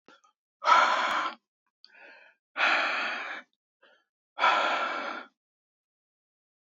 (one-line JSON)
{"exhalation_length": "6.7 s", "exhalation_amplitude": 13574, "exhalation_signal_mean_std_ratio": 0.45, "survey_phase": "beta (2021-08-13 to 2022-03-07)", "age": "18-44", "gender": "Male", "wearing_mask": "No", "symptom_cough_any": true, "symptom_runny_or_blocked_nose": true, "symptom_shortness_of_breath": true, "symptom_onset": "4 days", "smoker_status": "Never smoked", "respiratory_condition_asthma": false, "respiratory_condition_other": false, "recruitment_source": "REACT", "submission_delay": "3 days", "covid_test_result": "Negative", "covid_test_method": "RT-qPCR", "covid_ct_value": 38.8, "covid_ct_gene": "N gene", "influenza_a_test_result": "Negative", "influenza_b_test_result": "Negative"}